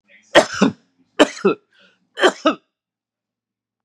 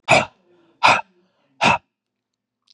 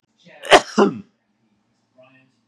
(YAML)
three_cough_length: 3.8 s
three_cough_amplitude: 32768
three_cough_signal_mean_std_ratio: 0.3
exhalation_length: 2.7 s
exhalation_amplitude: 31064
exhalation_signal_mean_std_ratio: 0.33
cough_length: 2.5 s
cough_amplitude: 32768
cough_signal_mean_std_ratio: 0.26
survey_phase: beta (2021-08-13 to 2022-03-07)
age: 45-64
gender: Male
wearing_mask: 'No'
symptom_none: true
smoker_status: Never smoked
respiratory_condition_asthma: false
respiratory_condition_other: false
recruitment_source: REACT
submission_delay: 2 days
covid_test_result: Negative
covid_test_method: RT-qPCR
influenza_a_test_result: Unknown/Void
influenza_b_test_result: Unknown/Void